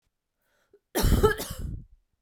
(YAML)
cough_length: 2.2 s
cough_amplitude: 13152
cough_signal_mean_std_ratio: 0.42
survey_phase: beta (2021-08-13 to 2022-03-07)
age: 18-44
gender: Female
wearing_mask: 'No'
symptom_cough_any: true
symptom_runny_or_blocked_nose: true
symptom_abdominal_pain: true
symptom_fatigue: true
symptom_fever_high_temperature: true
symptom_onset: 3 days
smoker_status: Never smoked
respiratory_condition_asthma: false
respiratory_condition_other: false
recruitment_source: Test and Trace
submission_delay: 2 days
covid_test_result: Positive
covid_test_method: RT-qPCR
covid_ct_value: 16.1
covid_ct_gene: ORF1ab gene
covid_ct_mean: 16.4
covid_viral_load: 4100000 copies/ml
covid_viral_load_category: High viral load (>1M copies/ml)